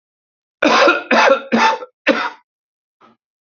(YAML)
cough_length: 3.4 s
cough_amplitude: 28565
cough_signal_mean_std_ratio: 0.49
survey_phase: alpha (2021-03-01 to 2021-08-12)
age: 45-64
gender: Male
wearing_mask: 'No'
symptom_abdominal_pain: true
symptom_onset: 5 days
smoker_status: Current smoker (1 to 10 cigarettes per day)
respiratory_condition_asthma: false
respiratory_condition_other: false
recruitment_source: REACT
submission_delay: 1 day
covid_test_result: Negative
covid_test_method: RT-qPCR